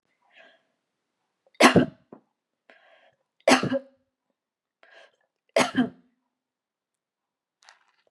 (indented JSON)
{
  "three_cough_length": "8.1 s",
  "three_cough_amplitude": 29904,
  "three_cough_signal_mean_std_ratio": 0.23,
  "survey_phase": "beta (2021-08-13 to 2022-03-07)",
  "age": "18-44",
  "gender": "Female",
  "wearing_mask": "No",
  "symptom_none": true,
  "smoker_status": "Ex-smoker",
  "respiratory_condition_asthma": false,
  "respiratory_condition_other": false,
  "recruitment_source": "REACT",
  "submission_delay": "4 days",
  "covid_test_result": "Negative",
  "covid_test_method": "RT-qPCR",
  "influenza_a_test_result": "Negative",
  "influenza_b_test_result": "Negative"
}